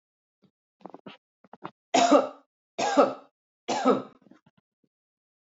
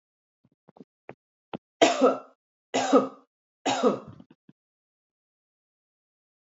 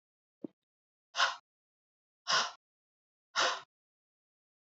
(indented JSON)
{
  "cough_length": "5.5 s",
  "cough_amplitude": 16123,
  "cough_signal_mean_std_ratio": 0.32,
  "three_cough_length": "6.5 s",
  "three_cough_amplitude": 20204,
  "three_cough_signal_mean_std_ratio": 0.29,
  "exhalation_length": "4.7 s",
  "exhalation_amplitude": 4959,
  "exhalation_signal_mean_std_ratio": 0.28,
  "survey_phase": "alpha (2021-03-01 to 2021-08-12)",
  "age": "45-64",
  "gender": "Female",
  "wearing_mask": "No",
  "symptom_none": true,
  "smoker_status": "Never smoked",
  "respiratory_condition_asthma": true,
  "respiratory_condition_other": false,
  "recruitment_source": "Test and Trace",
  "submission_delay": "0 days",
  "covid_test_result": "Negative",
  "covid_test_method": "LFT"
}